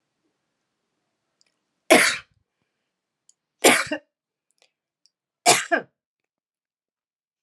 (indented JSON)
{
  "three_cough_length": "7.4 s",
  "three_cough_amplitude": 32167,
  "three_cough_signal_mean_std_ratio": 0.23,
  "survey_phase": "beta (2021-08-13 to 2022-03-07)",
  "age": "65+",
  "gender": "Female",
  "wearing_mask": "No",
  "symptom_shortness_of_breath": true,
  "smoker_status": "Never smoked",
  "respiratory_condition_asthma": false,
  "respiratory_condition_other": true,
  "recruitment_source": "REACT",
  "submission_delay": "1 day",
  "covid_test_result": "Negative",
  "covid_test_method": "RT-qPCR",
  "influenza_a_test_result": "Negative",
  "influenza_b_test_result": "Negative"
}